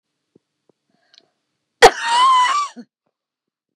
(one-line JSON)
{"cough_length": "3.8 s", "cough_amplitude": 32768, "cough_signal_mean_std_ratio": 0.35, "survey_phase": "beta (2021-08-13 to 2022-03-07)", "age": "45-64", "gender": "Female", "wearing_mask": "No", "symptom_none": true, "smoker_status": "Ex-smoker", "respiratory_condition_asthma": false, "respiratory_condition_other": false, "recruitment_source": "REACT", "submission_delay": "1 day", "covid_test_result": "Negative", "covid_test_method": "RT-qPCR", "influenza_a_test_result": "Negative", "influenza_b_test_result": "Negative"}